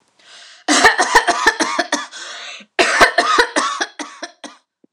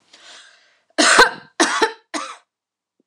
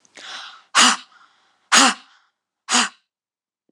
{
  "cough_length": "4.9 s",
  "cough_amplitude": 26028,
  "cough_signal_mean_std_ratio": 0.54,
  "three_cough_length": "3.1 s",
  "three_cough_amplitude": 26028,
  "three_cough_signal_mean_std_ratio": 0.37,
  "exhalation_length": "3.7 s",
  "exhalation_amplitude": 26028,
  "exhalation_signal_mean_std_ratio": 0.34,
  "survey_phase": "alpha (2021-03-01 to 2021-08-12)",
  "age": "18-44",
  "gender": "Female",
  "wearing_mask": "No",
  "symptom_none": true,
  "smoker_status": "Never smoked",
  "respiratory_condition_asthma": false,
  "respiratory_condition_other": false,
  "recruitment_source": "REACT",
  "submission_delay": "2 days",
  "covid_test_result": "Negative",
  "covid_test_method": "RT-qPCR"
}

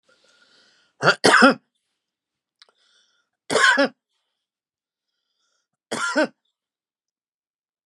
{
  "three_cough_length": "7.9 s",
  "three_cough_amplitude": 29582,
  "three_cough_signal_mean_std_ratio": 0.28,
  "survey_phase": "beta (2021-08-13 to 2022-03-07)",
  "age": "65+",
  "gender": "Male",
  "wearing_mask": "No",
  "symptom_none": true,
  "smoker_status": "Ex-smoker",
  "respiratory_condition_asthma": false,
  "respiratory_condition_other": false,
  "recruitment_source": "REACT",
  "submission_delay": "4 days",
  "covid_test_result": "Negative",
  "covid_test_method": "RT-qPCR",
  "influenza_a_test_result": "Negative",
  "influenza_b_test_result": "Negative"
}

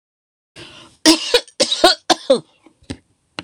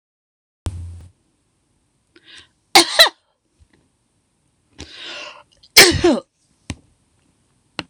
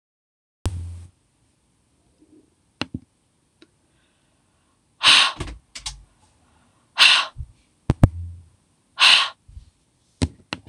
{
  "three_cough_length": "3.4 s",
  "three_cough_amplitude": 26028,
  "three_cough_signal_mean_std_ratio": 0.35,
  "cough_length": "7.9 s",
  "cough_amplitude": 26028,
  "cough_signal_mean_std_ratio": 0.24,
  "exhalation_length": "10.7 s",
  "exhalation_amplitude": 26028,
  "exhalation_signal_mean_std_ratio": 0.27,
  "survey_phase": "beta (2021-08-13 to 2022-03-07)",
  "age": "65+",
  "gender": "Female",
  "wearing_mask": "No",
  "symptom_none": true,
  "smoker_status": "Never smoked",
  "respiratory_condition_asthma": false,
  "respiratory_condition_other": false,
  "recruitment_source": "REACT",
  "submission_delay": "2 days",
  "covid_test_result": "Negative",
  "covid_test_method": "RT-qPCR"
}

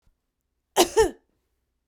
{
  "cough_length": "1.9 s",
  "cough_amplitude": 28228,
  "cough_signal_mean_std_ratio": 0.28,
  "survey_phase": "beta (2021-08-13 to 2022-03-07)",
  "age": "45-64",
  "gender": "Female",
  "wearing_mask": "No",
  "symptom_none": true,
  "smoker_status": "Never smoked",
  "respiratory_condition_asthma": false,
  "respiratory_condition_other": false,
  "recruitment_source": "REACT",
  "submission_delay": "2 days",
  "covid_test_result": "Negative",
  "covid_test_method": "RT-qPCR",
  "influenza_a_test_result": "Negative",
  "influenza_b_test_result": "Negative"
}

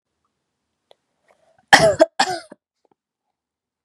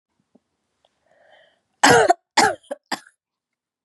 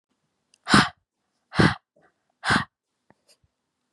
{
  "cough_length": "3.8 s",
  "cough_amplitude": 32768,
  "cough_signal_mean_std_ratio": 0.24,
  "three_cough_length": "3.8 s",
  "three_cough_amplitude": 32767,
  "three_cough_signal_mean_std_ratio": 0.28,
  "exhalation_length": "3.9 s",
  "exhalation_amplitude": 25099,
  "exhalation_signal_mean_std_ratio": 0.27,
  "survey_phase": "beta (2021-08-13 to 2022-03-07)",
  "age": "18-44",
  "gender": "Female",
  "wearing_mask": "No",
  "symptom_none": true,
  "smoker_status": "Never smoked",
  "respiratory_condition_asthma": false,
  "respiratory_condition_other": false,
  "recruitment_source": "REACT",
  "submission_delay": "3 days",
  "covid_test_result": "Negative",
  "covid_test_method": "RT-qPCR",
  "influenza_a_test_result": "Negative",
  "influenza_b_test_result": "Negative"
}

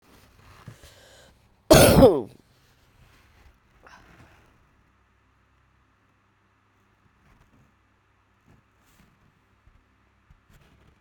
{
  "cough_length": "11.0 s",
  "cough_amplitude": 32328,
  "cough_signal_mean_std_ratio": 0.18,
  "survey_phase": "beta (2021-08-13 to 2022-03-07)",
  "age": "45-64",
  "gender": "Female",
  "wearing_mask": "No",
  "symptom_cough_any": true,
  "symptom_runny_or_blocked_nose": true,
  "symptom_sore_throat": true,
  "symptom_change_to_sense_of_smell_or_taste": true,
  "symptom_onset": "4 days",
  "smoker_status": "Never smoked",
  "respiratory_condition_asthma": false,
  "respiratory_condition_other": false,
  "recruitment_source": "Test and Trace",
  "submission_delay": "2 days",
  "covid_test_result": "Positive",
  "covid_test_method": "RT-qPCR",
  "covid_ct_value": 20.9,
  "covid_ct_gene": "ORF1ab gene"
}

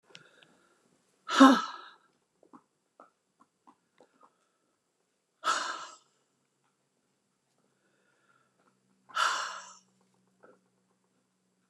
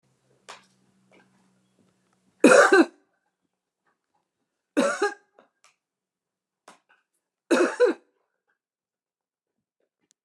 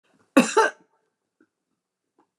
{
  "exhalation_length": "11.7 s",
  "exhalation_amplitude": 19747,
  "exhalation_signal_mean_std_ratio": 0.19,
  "three_cough_length": "10.2 s",
  "three_cough_amplitude": 21650,
  "three_cough_signal_mean_std_ratio": 0.24,
  "cough_length": "2.4 s",
  "cough_amplitude": 29037,
  "cough_signal_mean_std_ratio": 0.24,
  "survey_phase": "beta (2021-08-13 to 2022-03-07)",
  "age": "65+",
  "gender": "Female",
  "wearing_mask": "No",
  "symptom_none": true,
  "smoker_status": "Never smoked",
  "respiratory_condition_asthma": false,
  "respiratory_condition_other": false,
  "recruitment_source": "REACT",
  "submission_delay": "4 days",
  "covid_test_result": "Negative",
  "covid_test_method": "RT-qPCR"
}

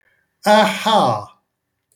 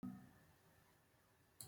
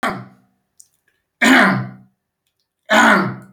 {
  "exhalation_length": "2.0 s",
  "exhalation_amplitude": 27352,
  "exhalation_signal_mean_std_ratio": 0.5,
  "cough_length": "1.7 s",
  "cough_amplitude": 682,
  "cough_signal_mean_std_ratio": 0.47,
  "three_cough_length": "3.5 s",
  "three_cough_amplitude": 29898,
  "three_cough_signal_mean_std_ratio": 0.43,
  "survey_phase": "beta (2021-08-13 to 2022-03-07)",
  "age": "45-64",
  "gender": "Male",
  "wearing_mask": "No",
  "symptom_none": true,
  "smoker_status": "Never smoked",
  "respiratory_condition_asthma": false,
  "respiratory_condition_other": false,
  "recruitment_source": "REACT",
  "submission_delay": "1 day",
  "covid_test_result": "Negative",
  "covid_test_method": "RT-qPCR"
}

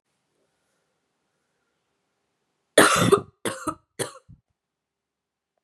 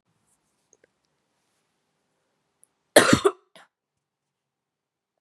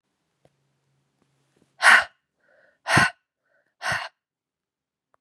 {
  "three_cough_length": "5.6 s",
  "three_cough_amplitude": 30831,
  "three_cough_signal_mean_std_ratio": 0.23,
  "cough_length": "5.2 s",
  "cough_amplitude": 32432,
  "cough_signal_mean_std_ratio": 0.17,
  "exhalation_length": "5.2 s",
  "exhalation_amplitude": 27557,
  "exhalation_signal_mean_std_ratio": 0.24,
  "survey_phase": "beta (2021-08-13 to 2022-03-07)",
  "age": "18-44",
  "gender": "Female",
  "wearing_mask": "No",
  "symptom_cough_any": true,
  "symptom_new_continuous_cough": true,
  "symptom_runny_or_blocked_nose": true,
  "symptom_sore_throat": true,
  "symptom_abdominal_pain": true,
  "symptom_fatigue": true,
  "symptom_fever_high_temperature": true,
  "symptom_headache": true,
  "symptom_onset": "3 days",
  "smoker_status": "Current smoker (1 to 10 cigarettes per day)",
  "respiratory_condition_asthma": false,
  "respiratory_condition_other": false,
  "recruitment_source": "Test and Trace",
  "submission_delay": "1 day",
  "covid_test_result": "Positive",
  "covid_test_method": "RT-qPCR",
  "covid_ct_value": 23.6,
  "covid_ct_gene": "ORF1ab gene",
  "covid_ct_mean": 23.9,
  "covid_viral_load": "15000 copies/ml",
  "covid_viral_load_category": "Low viral load (10K-1M copies/ml)"
}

